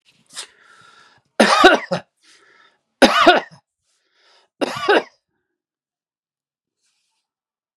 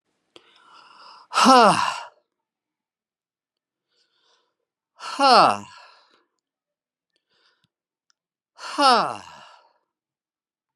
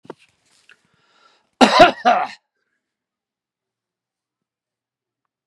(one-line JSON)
{"three_cough_length": "7.8 s", "three_cough_amplitude": 32768, "three_cough_signal_mean_std_ratio": 0.29, "exhalation_length": "10.8 s", "exhalation_amplitude": 31112, "exhalation_signal_mean_std_ratio": 0.27, "cough_length": "5.5 s", "cough_amplitude": 32768, "cough_signal_mean_std_ratio": 0.23, "survey_phase": "beta (2021-08-13 to 2022-03-07)", "age": "65+", "gender": "Male", "wearing_mask": "No", "symptom_none": true, "smoker_status": "Never smoked", "respiratory_condition_asthma": false, "respiratory_condition_other": false, "recruitment_source": "REACT", "submission_delay": "2 days", "covid_test_result": "Negative", "covid_test_method": "RT-qPCR", "influenza_a_test_result": "Negative", "influenza_b_test_result": "Negative"}